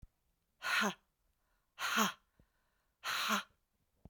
exhalation_length: 4.1 s
exhalation_amplitude: 4708
exhalation_signal_mean_std_ratio: 0.41
survey_phase: beta (2021-08-13 to 2022-03-07)
age: 18-44
gender: Female
wearing_mask: 'No'
symptom_cough_any: true
symptom_runny_or_blocked_nose: true
symptom_fatigue: true
symptom_fever_high_temperature: true
symptom_headache: true
symptom_change_to_sense_of_smell_or_taste: true
symptom_loss_of_taste: true
symptom_onset: 5 days
smoker_status: Ex-smoker
respiratory_condition_asthma: false
respiratory_condition_other: false
recruitment_source: Test and Trace
submission_delay: 2 days
covid_test_result: Positive
covid_test_method: RT-qPCR
covid_ct_value: 22.3
covid_ct_gene: N gene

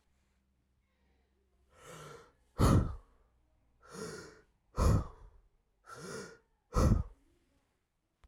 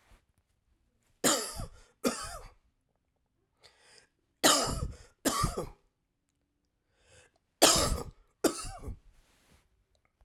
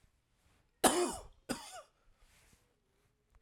exhalation_length: 8.3 s
exhalation_amplitude: 6602
exhalation_signal_mean_std_ratio: 0.31
three_cough_length: 10.2 s
three_cough_amplitude: 17157
three_cough_signal_mean_std_ratio: 0.33
cough_length: 3.4 s
cough_amplitude: 9390
cough_signal_mean_std_ratio: 0.27
survey_phase: beta (2021-08-13 to 2022-03-07)
age: 45-64
gender: Male
wearing_mask: 'No'
symptom_cough_any: true
smoker_status: Never smoked
respiratory_condition_asthma: false
respiratory_condition_other: false
recruitment_source: REACT
submission_delay: 5 days
covid_test_result: Negative
covid_test_method: RT-qPCR
influenza_a_test_result: Negative
influenza_b_test_result: Negative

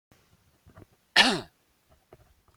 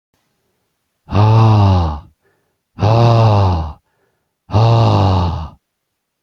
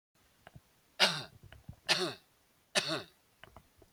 cough_length: 2.6 s
cough_amplitude: 22184
cough_signal_mean_std_ratio: 0.23
exhalation_length: 6.2 s
exhalation_amplitude: 30285
exhalation_signal_mean_std_ratio: 0.63
three_cough_length: 3.9 s
three_cough_amplitude: 8908
three_cough_signal_mean_std_ratio: 0.32
survey_phase: beta (2021-08-13 to 2022-03-07)
age: 45-64
gender: Male
wearing_mask: 'No'
symptom_none: true
smoker_status: Never smoked
respiratory_condition_asthma: false
respiratory_condition_other: false
recruitment_source: REACT
submission_delay: 2 days
covid_test_result: Negative
covid_test_method: RT-qPCR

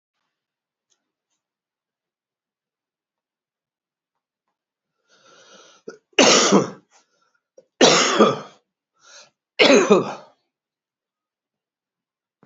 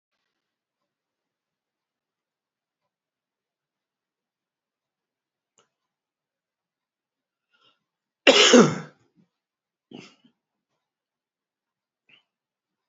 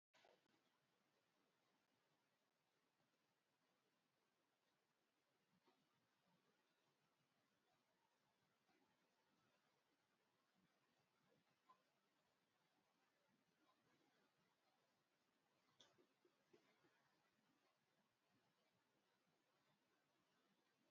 three_cough_length: 12.5 s
three_cough_amplitude: 31313
three_cough_signal_mean_std_ratio: 0.27
cough_length: 12.9 s
cough_amplitude: 29258
cough_signal_mean_std_ratio: 0.15
exhalation_length: 20.9 s
exhalation_amplitude: 68
exhalation_signal_mean_std_ratio: 0.76
survey_phase: beta (2021-08-13 to 2022-03-07)
age: 65+
gender: Male
wearing_mask: 'No'
symptom_cough_any: true
symptom_fatigue: true
symptom_headache: true
smoker_status: Ex-smoker
respiratory_condition_asthma: false
respiratory_condition_other: false
recruitment_source: Test and Trace
submission_delay: 2 days
covid_test_result: Positive
covid_test_method: RT-qPCR
covid_ct_value: 18.1
covid_ct_gene: N gene
covid_ct_mean: 18.1
covid_viral_load: 1200000 copies/ml
covid_viral_load_category: High viral load (>1M copies/ml)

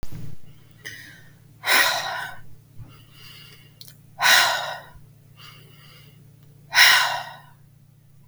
exhalation_length: 8.3 s
exhalation_amplitude: 32766
exhalation_signal_mean_std_ratio: 0.41
survey_phase: beta (2021-08-13 to 2022-03-07)
age: 45-64
gender: Female
wearing_mask: 'No'
symptom_runny_or_blocked_nose: true
symptom_fatigue: true
symptom_headache: true
symptom_onset: 12 days
smoker_status: Never smoked
respiratory_condition_asthma: false
respiratory_condition_other: false
recruitment_source: REACT
submission_delay: 2 days
covid_test_result: Negative
covid_test_method: RT-qPCR
influenza_a_test_result: Negative
influenza_b_test_result: Negative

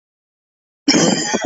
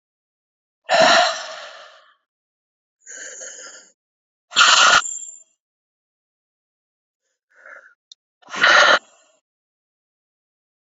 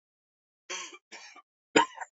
cough_length: 1.5 s
cough_amplitude: 30363
cough_signal_mean_std_ratio: 0.5
exhalation_length: 10.8 s
exhalation_amplitude: 29960
exhalation_signal_mean_std_ratio: 0.31
three_cough_length: 2.1 s
three_cough_amplitude: 18004
three_cough_signal_mean_std_ratio: 0.24
survey_phase: beta (2021-08-13 to 2022-03-07)
age: 18-44
gender: Male
wearing_mask: 'No'
symptom_cough_any: true
symptom_new_continuous_cough: true
symptom_runny_or_blocked_nose: true
symptom_abdominal_pain: true
symptom_fatigue: true
symptom_headache: true
symptom_change_to_sense_of_smell_or_taste: true
symptom_loss_of_taste: true
symptom_onset: 4 days
smoker_status: Never smoked
respiratory_condition_asthma: true
respiratory_condition_other: false
recruitment_source: Test and Trace
submission_delay: 1 day
covid_test_result: Positive
covid_test_method: RT-qPCR
covid_ct_value: 18.0
covid_ct_gene: ORF1ab gene
covid_ct_mean: 19.4
covid_viral_load: 440000 copies/ml
covid_viral_load_category: Low viral load (10K-1M copies/ml)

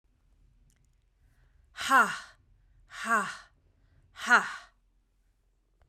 exhalation_length: 5.9 s
exhalation_amplitude: 12092
exhalation_signal_mean_std_ratio: 0.29
survey_phase: beta (2021-08-13 to 2022-03-07)
age: 45-64
gender: Female
wearing_mask: 'No'
symptom_none: true
smoker_status: Never smoked
respiratory_condition_asthma: false
respiratory_condition_other: false
recruitment_source: REACT
submission_delay: 0 days
covid_test_result: Negative
covid_test_method: RT-qPCR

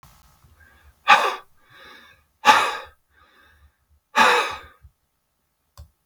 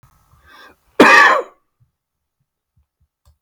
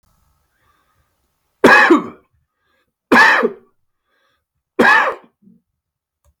exhalation_length: 6.1 s
exhalation_amplitude: 32768
exhalation_signal_mean_std_ratio: 0.3
cough_length: 3.4 s
cough_amplitude: 32768
cough_signal_mean_std_ratio: 0.29
three_cough_length: 6.4 s
three_cough_amplitude: 32768
three_cough_signal_mean_std_ratio: 0.34
survey_phase: beta (2021-08-13 to 2022-03-07)
age: 65+
gender: Male
wearing_mask: 'No'
symptom_none: true
smoker_status: Ex-smoker
respiratory_condition_asthma: false
respiratory_condition_other: false
recruitment_source: REACT
submission_delay: 5 days
covid_test_result: Negative
covid_test_method: RT-qPCR
influenza_a_test_result: Negative
influenza_b_test_result: Negative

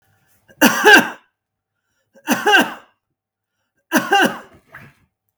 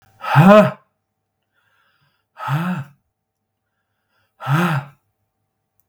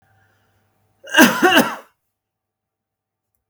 three_cough_length: 5.4 s
three_cough_amplitude: 32768
three_cough_signal_mean_std_ratio: 0.36
exhalation_length: 5.9 s
exhalation_amplitude: 32766
exhalation_signal_mean_std_ratio: 0.32
cough_length: 3.5 s
cough_amplitude: 32768
cough_signal_mean_std_ratio: 0.3
survey_phase: beta (2021-08-13 to 2022-03-07)
age: 65+
gender: Male
wearing_mask: 'No'
symptom_none: true
smoker_status: Never smoked
respiratory_condition_asthma: false
respiratory_condition_other: false
recruitment_source: REACT
submission_delay: 1 day
covid_test_result: Negative
covid_test_method: RT-qPCR
influenza_a_test_result: Negative
influenza_b_test_result: Negative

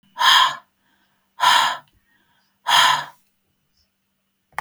exhalation_length: 4.6 s
exhalation_amplitude: 32158
exhalation_signal_mean_std_ratio: 0.39
survey_phase: beta (2021-08-13 to 2022-03-07)
age: 45-64
gender: Female
wearing_mask: 'No'
symptom_none: true
smoker_status: Never smoked
respiratory_condition_asthma: false
respiratory_condition_other: false
recruitment_source: REACT
submission_delay: 2 days
covid_test_result: Negative
covid_test_method: RT-qPCR
influenza_a_test_result: Negative
influenza_b_test_result: Negative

